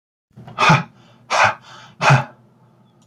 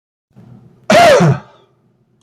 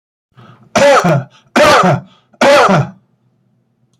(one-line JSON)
{"exhalation_length": "3.1 s", "exhalation_amplitude": 27880, "exhalation_signal_mean_std_ratio": 0.4, "cough_length": "2.2 s", "cough_amplitude": 30185, "cough_signal_mean_std_ratio": 0.44, "three_cough_length": "4.0 s", "three_cough_amplitude": 30289, "three_cough_signal_mean_std_ratio": 0.56, "survey_phase": "beta (2021-08-13 to 2022-03-07)", "age": "45-64", "gender": "Male", "wearing_mask": "No", "symptom_change_to_sense_of_smell_or_taste": true, "symptom_loss_of_taste": true, "smoker_status": "Ex-smoker", "respiratory_condition_asthma": false, "respiratory_condition_other": false, "recruitment_source": "REACT", "submission_delay": "1 day", "covid_test_result": "Negative", "covid_test_method": "RT-qPCR"}